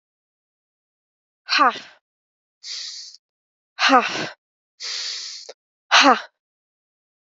{"exhalation_length": "7.3 s", "exhalation_amplitude": 29030, "exhalation_signal_mean_std_ratio": 0.31, "survey_phase": "alpha (2021-03-01 to 2021-08-12)", "age": "18-44", "gender": "Female", "wearing_mask": "No", "symptom_cough_any": true, "symptom_shortness_of_breath": true, "symptom_fatigue": true, "symptom_fever_high_temperature": true, "symptom_headache": true, "symptom_change_to_sense_of_smell_or_taste": true, "symptom_loss_of_taste": true, "symptom_onset": "2 days", "smoker_status": "Never smoked", "respiratory_condition_asthma": false, "respiratory_condition_other": false, "recruitment_source": "Test and Trace", "submission_delay": "2 days", "covid_test_result": "Positive", "covid_test_method": "RT-qPCR", "covid_ct_value": 20.3, "covid_ct_gene": "ORF1ab gene", "covid_ct_mean": 20.9, "covid_viral_load": "140000 copies/ml", "covid_viral_load_category": "Low viral load (10K-1M copies/ml)"}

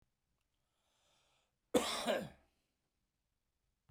{"cough_length": "3.9 s", "cough_amplitude": 5201, "cough_signal_mean_std_ratio": 0.27, "survey_phase": "beta (2021-08-13 to 2022-03-07)", "age": "45-64", "gender": "Male", "wearing_mask": "No", "symptom_none": true, "smoker_status": "Never smoked", "respiratory_condition_asthma": false, "respiratory_condition_other": true, "recruitment_source": "REACT", "submission_delay": "1 day", "covid_test_result": "Negative", "covid_test_method": "RT-qPCR"}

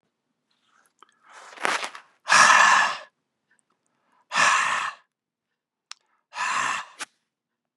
{"exhalation_length": "7.8 s", "exhalation_amplitude": 26602, "exhalation_signal_mean_std_ratio": 0.37, "survey_phase": "beta (2021-08-13 to 2022-03-07)", "age": "45-64", "gender": "Male", "wearing_mask": "No", "symptom_cough_any": true, "symptom_runny_or_blocked_nose": true, "symptom_sore_throat": true, "smoker_status": "Never smoked", "respiratory_condition_asthma": false, "respiratory_condition_other": false, "recruitment_source": "Test and Trace", "submission_delay": "2 days", "covid_test_result": "Positive", "covid_test_method": "LFT"}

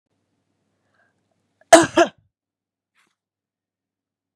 {"cough_length": "4.4 s", "cough_amplitude": 32768, "cough_signal_mean_std_ratio": 0.17, "survey_phase": "beta (2021-08-13 to 2022-03-07)", "age": "45-64", "gender": "Female", "wearing_mask": "No", "symptom_none": true, "smoker_status": "Never smoked", "respiratory_condition_asthma": false, "respiratory_condition_other": false, "recruitment_source": "Test and Trace", "submission_delay": "1 day", "covid_test_result": "Positive", "covid_test_method": "ePCR"}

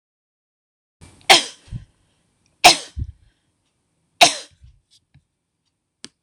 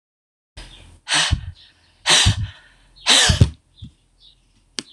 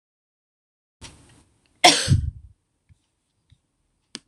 {"three_cough_length": "6.2 s", "three_cough_amplitude": 26028, "three_cough_signal_mean_std_ratio": 0.2, "exhalation_length": "4.9 s", "exhalation_amplitude": 26028, "exhalation_signal_mean_std_ratio": 0.39, "cough_length": "4.3 s", "cough_amplitude": 26028, "cough_signal_mean_std_ratio": 0.23, "survey_phase": "alpha (2021-03-01 to 2021-08-12)", "age": "65+", "gender": "Female", "wearing_mask": "No", "symptom_none": true, "smoker_status": "Never smoked", "respiratory_condition_asthma": false, "respiratory_condition_other": false, "recruitment_source": "REACT", "submission_delay": "-1 day", "covid_test_result": "Negative", "covid_test_method": "RT-qPCR"}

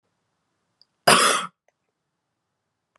{"cough_length": "3.0 s", "cough_amplitude": 28423, "cough_signal_mean_std_ratio": 0.26, "survey_phase": "beta (2021-08-13 to 2022-03-07)", "age": "18-44", "gender": "Female", "wearing_mask": "No", "symptom_cough_any": true, "symptom_new_continuous_cough": true, "symptom_runny_or_blocked_nose": true, "symptom_shortness_of_breath": true, "symptom_sore_throat": true, "symptom_fatigue": true, "symptom_fever_high_temperature": true, "symptom_headache": true, "symptom_onset": "2 days", "smoker_status": "Never smoked", "respiratory_condition_asthma": false, "respiratory_condition_other": false, "recruitment_source": "Test and Trace", "submission_delay": "2 days", "covid_test_result": "Positive", "covid_test_method": "ePCR"}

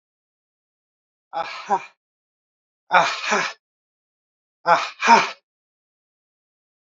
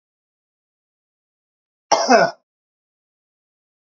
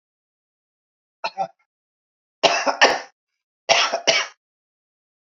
{"exhalation_length": "7.0 s", "exhalation_amplitude": 27547, "exhalation_signal_mean_std_ratio": 0.3, "cough_length": "3.8 s", "cough_amplitude": 28094, "cough_signal_mean_std_ratio": 0.23, "three_cough_length": "5.4 s", "three_cough_amplitude": 27762, "three_cough_signal_mean_std_ratio": 0.33, "survey_phase": "beta (2021-08-13 to 2022-03-07)", "age": "45-64", "gender": "Male", "wearing_mask": "No", "symptom_none": true, "smoker_status": "Current smoker (e-cigarettes or vapes only)", "respiratory_condition_asthma": false, "respiratory_condition_other": false, "recruitment_source": "REACT", "submission_delay": "2 days", "covid_test_result": "Negative", "covid_test_method": "RT-qPCR", "influenza_a_test_result": "Negative", "influenza_b_test_result": "Negative"}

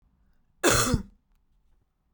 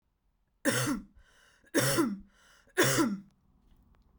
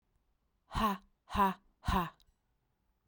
{"cough_length": "2.1 s", "cough_amplitude": 16880, "cough_signal_mean_std_ratio": 0.34, "three_cough_length": "4.2 s", "three_cough_amplitude": 8211, "three_cough_signal_mean_std_ratio": 0.46, "exhalation_length": "3.1 s", "exhalation_amplitude": 4160, "exhalation_signal_mean_std_ratio": 0.38, "survey_phase": "beta (2021-08-13 to 2022-03-07)", "age": "18-44", "gender": "Female", "wearing_mask": "No", "symptom_runny_or_blocked_nose": true, "symptom_sore_throat": true, "symptom_headache": true, "smoker_status": "Never smoked", "respiratory_condition_asthma": false, "respiratory_condition_other": false, "recruitment_source": "Test and Trace", "submission_delay": "1 day", "covid_test_result": "Positive", "covid_test_method": "RT-qPCR", "covid_ct_value": 22.4, "covid_ct_gene": "ORF1ab gene", "covid_ct_mean": 23.1, "covid_viral_load": "27000 copies/ml", "covid_viral_load_category": "Low viral load (10K-1M copies/ml)"}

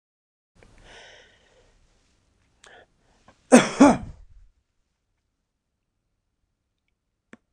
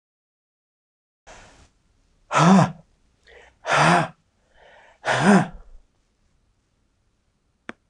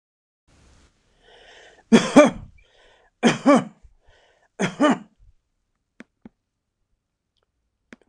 {"cough_length": "7.5 s", "cough_amplitude": 26028, "cough_signal_mean_std_ratio": 0.17, "exhalation_length": "7.9 s", "exhalation_amplitude": 25518, "exhalation_signal_mean_std_ratio": 0.32, "three_cough_length": "8.1 s", "three_cough_amplitude": 26028, "three_cough_signal_mean_std_ratio": 0.26, "survey_phase": "beta (2021-08-13 to 2022-03-07)", "age": "65+", "gender": "Male", "wearing_mask": "No", "symptom_none": true, "smoker_status": "Never smoked", "respiratory_condition_asthma": false, "respiratory_condition_other": false, "recruitment_source": "REACT", "submission_delay": "2 days", "covid_test_result": "Negative", "covid_test_method": "RT-qPCR", "influenza_a_test_result": "Negative", "influenza_b_test_result": "Negative"}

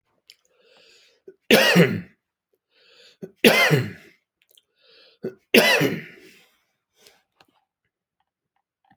{"three_cough_length": "9.0 s", "three_cough_amplitude": 30418, "three_cough_signal_mean_std_ratio": 0.31, "survey_phase": "alpha (2021-03-01 to 2021-08-12)", "age": "65+", "gender": "Male", "wearing_mask": "No", "symptom_abdominal_pain": true, "symptom_onset": "8 days", "smoker_status": "Ex-smoker", "respiratory_condition_asthma": false, "respiratory_condition_other": false, "recruitment_source": "REACT", "submission_delay": "1 day", "covid_test_result": "Negative", "covid_test_method": "RT-qPCR"}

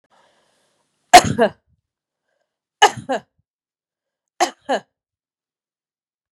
{"three_cough_length": "6.3 s", "three_cough_amplitude": 32768, "three_cough_signal_mean_std_ratio": 0.2, "survey_phase": "beta (2021-08-13 to 2022-03-07)", "age": "45-64", "gender": "Female", "wearing_mask": "No", "symptom_runny_or_blocked_nose": true, "smoker_status": "Never smoked", "respiratory_condition_asthma": false, "respiratory_condition_other": false, "recruitment_source": "Test and Trace", "submission_delay": "1 day", "covid_test_result": "Positive", "covid_test_method": "RT-qPCR", "covid_ct_value": 20.8, "covid_ct_gene": "ORF1ab gene"}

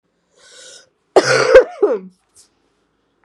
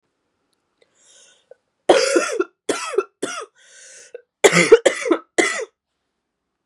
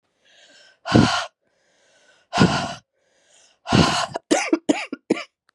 {"cough_length": "3.2 s", "cough_amplitude": 32768, "cough_signal_mean_std_ratio": 0.34, "three_cough_length": "6.7 s", "three_cough_amplitude": 32768, "three_cough_signal_mean_std_ratio": 0.35, "exhalation_length": "5.5 s", "exhalation_amplitude": 31794, "exhalation_signal_mean_std_ratio": 0.4, "survey_phase": "beta (2021-08-13 to 2022-03-07)", "age": "18-44", "gender": "Female", "wearing_mask": "No", "symptom_cough_any": true, "symptom_new_continuous_cough": true, "symptom_runny_or_blocked_nose": true, "symptom_shortness_of_breath": true, "symptom_sore_throat": true, "symptom_abdominal_pain": true, "symptom_fatigue": true, "symptom_fever_high_temperature": true, "symptom_headache": true, "symptom_other": true, "symptom_onset": "3 days", "smoker_status": "Never smoked", "respiratory_condition_asthma": false, "respiratory_condition_other": false, "recruitment_source": "Test and Trace", "submission_delay": "2 days", "covid_test_result": "Positive", "covid_test_method": "RT-qPCR", "covid_ct_value": 23.3, "covid_ct_gene": "ORF1ab gene", "covid_ct_mean": 23.7, "covid_viral_load": "17000 copies/ml", "covid_viral_load_category": "Low viral load (10K-1M copies/ml)"}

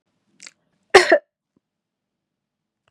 {"cough_length": "2.9 s", "cough_amplitude": 32768, "cough_signal_mean_std_ratio": 0.19, "survey_phase": "beta (2021-08-13 to 2022-03-07)", "age": "18-44", "gender": "Female", "wearing_mask": "No", "symptom_none": true, "smoker_status": "Never smoked", "respiratory_condition_asthma": false, "respiratory_condition_other": false, "recruitment_source": "REACT", "submission_delay": "2 days", "covid_test_result": "Negative", "covid_test_method": "RT-qPCR", "influenza_a_test_result": "Negative", "influenza_b_test_result": "Negative"}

